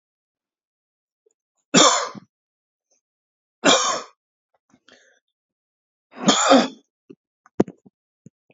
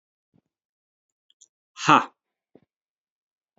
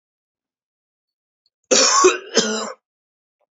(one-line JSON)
{"three_cough_length": "8.5 s", "three_cough_amplitude": 32341, "three_cough_signal_mean_std_ratio": 0.28, "exhalation_length": "3.6 s", "exhalation_amplitude": 27944, "exhalation_signal_mean_std_ratio": 0.16, "cough_length": "3.6 s", "cough_amplitude": 28925, "cough_signal_mean_std_ratio": 0.36, "survey_phase": "alpha (2021-03-01 to 2021-08-12)", "age": "18-44", "gender": "Male", "wearing_mask": "No", "symptom_none": true, "smoker_status": "Current smoker (e-cigarettes or vapes only)", "respiratory_condition_asthma": false, "respiratory_condition_other": false, "recruitment_source": "REACT", "submission_delay": "1 day", "covid_test_result": "Negative", "covid_test_method": "RT-qPCR"}